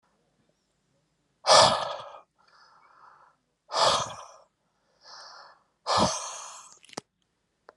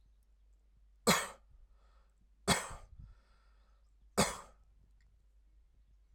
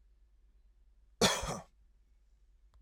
{"exhalation_length": "7.8 s", "exhalation_amplitude": 22045, "exhalation_signal_mean_std_ratio": 0.31, "three_cough_length": "6.1 s", "three_cough_amplitude": 5647, "three_cough_signal_mean_std_ratio": 0.27, "cough_length": "2.8 s", "cough_amplitude": 7151, "cough_signal_mean_std_ratio": 0.28, "survey_phase": "alpha (2021-03-01 to 2021-08-12)", "age": "45-64", "gender": "Male", "wearing_mask": "No", "symptom_none": true, "smoker_status": "Never smoked", "respiratory_condition_asthma": false, "respiratory_condition_other": false, "recruitment_source": "REACT", "submission_delay": "3 days", "covid_test_result": "Negative", "covid_test_method": "RT-qPCR"}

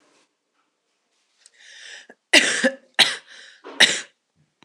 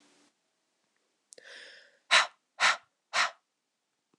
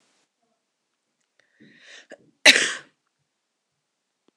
{"three_cough_length": "4.6 s", "three_cough_amplitude": 26028, "three_cough_signal_mean_std_ratio": 0.29, "exhalation_length": "4.2 s", "exhalation_amplitude": 15864, "exhalation_signal_mean_std_ratio": 0.26, "cough_length": "4.4 s", "cough_amplitude": 26028, "cough_signal_mean_std_ratio": 0.17, "survey_phase": "beta (2021-08-13 to 2022-03-07)", "age": "18-44", "gender": "Female", "wearing_mask": "No", "symptom_cough_any": true, "symptom_runny_or_blocked_nose": true, "symptom_sore_throat": true, "symptom_fatigue": true, "symptom_headache": true, "symptom_change_to_sense_of_smell_or_taste": true, "symptom_loss_of_taste": true, "symptom_onset": "7 days", "smoker_status": "Never smoked", "respiratory_condition_asthma": false, "respiratory_condition_other": false, "recruitment_source": "Test and Trace", "submission_delay": "2 days", "covid_test_result": "Positive", "covid_test_method": "ePCR"}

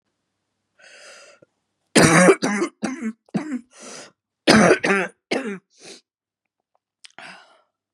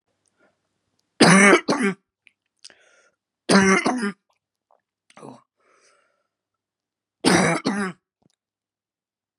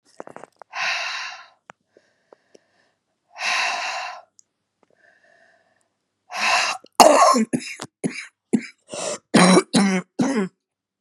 {"cough_length": "7.9 s", "cough_amplitude": 32767, "cough_signal_mean_std_ratio": 0.36, "three_cough_length": "9.4 s", "three_cough_amplitude": 31191, "three_cough_signal_mean_std_ratio": 0.33, "exhalation_length": "11.0 s", "exhalation_amplitude": 32768, "exhalation_signal_mean_std_ratio": 0.4, "survey_phase": "beta (2021-08-13 to 2022-03-07)", "age": "45-64", "gender": "Female", "wearing_mask": "No", "symptom_runny_or_blocked_nose": true, "symptom_shortness_of_breath": true, "symptom_sore_throat": true, "symptom_diarrhoea": true, "symptom_fatigue": true, "symptom_headache": true, "symptom_onset": "5 days", "smoker_status": "Never smoked", "respiratory_condition_asthma": false, "respiratory_condition_other": false, "recruitment_source": "Test and Trace", "submission_delay": "2 days", "covid_test_result": "Positive", "covid_test_method": "RT-qPCR", "covid_ct_value": 23.2, "covid_ct_gene": "N gene"}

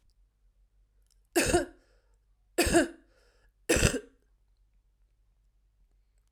{"three_cough_length": "6.3 s", "three_cough_amplitude": 13111, "three_cough_signal_mean_std_ratio": 0.3, "survey_phase": "alpha (2021-03-01 to 2021-08-12)", "age": "18-44", "gender": "Female", "wearing_mask": "No", "symptom_cough_any": true, "symptom_change_to_sense_of_smell_or_taste": true, "symptom_loss_of_taste": true, "smoker_status": "Never smoked", "respiratory_condition_asthma": false, "respiratory_condition_other": false, "recruitment_source": "Test and Trace", "submission_delay": "1 day", "covid_test_result": "Positive", "covid_test_method": "RT-qPCR"}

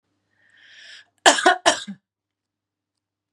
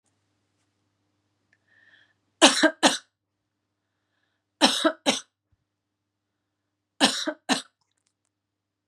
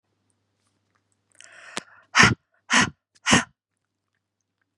{"cough_length": "3.3 s", "cough_amplitude": 32767, "cough_signal_mean_std_ratio": 0.26, "three_cough_length": "8.9 s", "three_cough_amplitude": 31273, "three_cough_signal_mean_std_ratio": 0.25, "exhalation_length": "4.8 s", "exhalation_amplitude": 31866, "exhalation_signal_mean_std_ratio": 0.26, "survey_phase": "beta (2021-08-13 to 2022-03-07)", "age": "18-44", "gender": "Female", "wearing_mask": "No", "symptom_runny_or_blocked_nose": true, "smoker_status": "Never smoked", "respiratory_condition_asthma": false, "respiratory_condition_other": false, "recruitment_source": "REACT", "submission_delay": "1 day", "covid_test_result": "Negative", "covid_test_method": "RT-qPCR", "influenza_a_test_result": "Negative", "influenza_b_test_result": "Negative"}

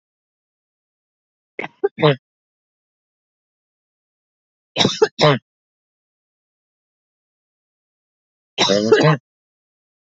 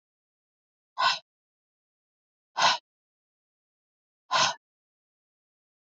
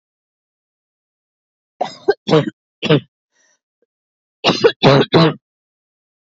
{"three_cough_length": "10.2 s", "three_cough_amplitude": 31631, "three_cough_signal_mean_std_ratio": 0.26, "exhalation_length": "6.0 s", "exhalation_amplitude": 11173, "exhalation_signal_mean_std_ratio": 0.24, "cough_length": "6.2 s", "cough_amplitude": 30545, "cough_signal_mean_std_ratio": 0.33, "survey_phase": "alpha (2021-03-01 to 2021-08-12)", "age": "45-64", "gender": "Female", "wearing_mask": "No", "symptom_none": true, "smoker_status": "Ex-smoker", "respiratory_condition_asthma": false, "respiratory_condition_other": false, "recruitment_source": "REACT", "submission_delay": "1 day", "covid_test_result": "Negative", "covid_test_method": "RT-qPCR"}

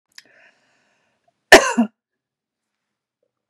{"cough_length": "3.5 s", "cough_amplitude": 32768, "cough_signal_mean_std_ratio": 0.19, "survey_phase": "beta (2021-08-13 to 2022-03-07)", "age": "45-64", "gender": "Female", "wearing_mask": "No", "symptom_none": true, "smoker_status": "Never smoked", "respiratory_condition_asthma": false, "respiratory_condition_other": false, "recruitment_source": "REACT", "submission_delay": "2 days", "covid_test_result": "Negative", "covid_test_method": "RT-qPCR", "influenza_a_test_result": "Negative", "influenza_b_test_result": "Negative"}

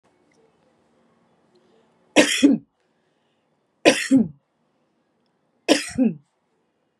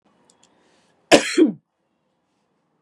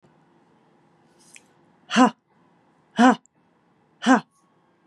{"three_cough_length": "7.0 s", "three_cough_amplitude": 32767, "three_cough_signal_mean_std_ratio": 0.29, "cough_length": "2.8 s", "cough_amplitude": 32767, "cough_signal_mean_std_ratio": 0.25, "exhalation_length": "4.9 s", "exhalation_amplitude": 25821, "exhalation_signal_mean_std_ratio": 0.24, "survey_phase": "beta (2021-08-13 to 2022-03-07)", "age": "45-64", "gender": "Female", "wearing_mask": "No", "symptom_none": true, "smoker_status": "Never smoked", "respiratory_condition_asthma": false, "respiratory_condition_other": false, "recruitment_source": "REACT", "submission_delay": "1 day", "covid_test_result": "Negative", "covid_test_method": "RT-qPCR", "influenza_a_test_result": "Negative", "influenza_b_test_result": "Negative"}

